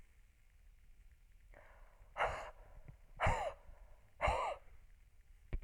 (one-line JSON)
{"exhalation_length": "5.6 s", "exhalation_amplitude": 3116, "exhalation_signal_mean_std_ratio": 0.44, "survey_phase": "alpha (2021-03-01 to 2021-08-12)", "age": "65+", "gender": "Female", "wearing_mask": "No", "symptom_none": true, "smoker_status": "Never smoked", "respiratory_condition_asthma": false, "respiratory_condition_other": false, "recruitment_source": "REACT", "submission_delay": "1 day", "covid_test_result": "Negative", "covid_test_method": "RT-qPCR"}